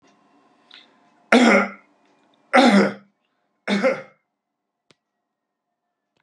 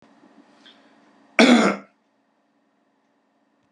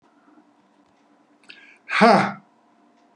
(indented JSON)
{
  "three_cough_length": "6.2 s",
  "three_cough_amplitude": 32767,
  "three_cough_signal_mean_std_ratio": 0.32,
  "cough_length": "3.7 s",
  "cough_amplitude": 28739,
  "cough_signal_mean_std_ratio": 0.26,
  "exhalation_length": "3.2 s",
  "exhalation_amplitude": 32438,
  "exhalation_signal_mean_std_ratio": 0.28,
  "survey_phase": "beta (2021-08-13 to 2022-03-07)",
  "age": "65+",
  "gender": "Male",
  "wearing_mask": "No",
  "symptom_none": true,
  "smoker_status": "Ex-smoker",
  "respiratory_condition_asthma": false,
  "respiratory_condition_other": false,
  "recruitment_source": "REACT",
  "submission_delay": "4 days",
  "covid_test_result": "Negative",
  "covid_test_method": "RT-qPCR",
  "influenza_a_test_result": "Negative",
  "influenza_b_test_result": "Negative"
}